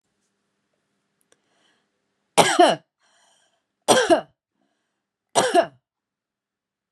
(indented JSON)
{
  "three_cough_length": "6.9 s",
  "three_cough_amplitude": 32768,
  "three_cough_signal_mean_std_ratio": 0.28,
  "survey_phase": "beta (2021-08-13 to 2022-03-07)",
  "age": "45-64",
  "gender": "Female",
  "wearing_mask": "Yes",
  "symptom_none": true,
  "smoker_status": "Current smoker (11 or more cigarettes per day)",
  "respiratory_condition_asthma": false,
  "respiratory_condition_other": false,
  "recruitment_source": "REACT",
  "submission_delay": "5 days",
  "covid_test_result": "Negative",
  "covid_test_method": "RT-qPCR"
}